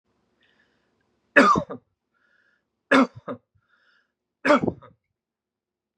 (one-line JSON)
{"three_cough_length": "6.0 s", "three_cough_amplitude": 30875, "three_cough_signal_mean_std_ratio": 0.27, "survey_phase": "beta (2021-08-13 to 2022-03-07)", "age": "18-44", "gender": "Male", "wearing_mask": "No", "symptom_none": true, "smoker_status": "Never smoked", "respiratory_condition_asthma": false, "respiratory_condition_other": false, "recruitment_source": "REACT", "submission_delay": "1 day", "covid_test_result": "Negative", "covid_test_method": "RT-qPCR"}